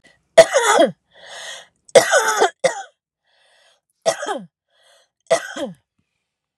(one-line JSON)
{"three_cough_length": "6.6 s", "three_cough_amplitude": 32768, "three_cough_signal_mean_std_ratio": 0.35, "survey_phase": "alpha (2021-03-01 to 2021-08-12)", "age": "45-64", "gender": "Female", "wearing_mask": "No", "symptom_none": true, "smoker_status": "Ex-smoker", "respiratory_condition_asthma": false, "respiratory_condition_other": false, "recruitment_source": "REACT", "submission_delay": "2 days", "covid_test_result": "Negative", "covid_test_method": "RT-qPCR"}